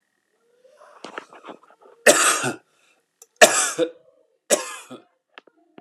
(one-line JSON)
{"three_cough_length": "5.8 s", "three_cough_amplitude": 32768, "three_cough_signal_mean_std_ratio": 0.3, "survey_phase": "alpha (2021-03-01 to 2021-08-12)", "age": "45-64", "gender": "Male", "wearing_mask": "No", "symptom_fatigue": true, "symptom_headache": true, "symptom_onset": "4 days", "smoker_status": "Never smoked", "respiratory_condition_asthma": true, "respiratory_condition_other": false, "recruitment_source": "Test and Trace", "submission_delay": "1 day", "covid_test_result": "Positive", "covid_test_method": "RT-qPCR"}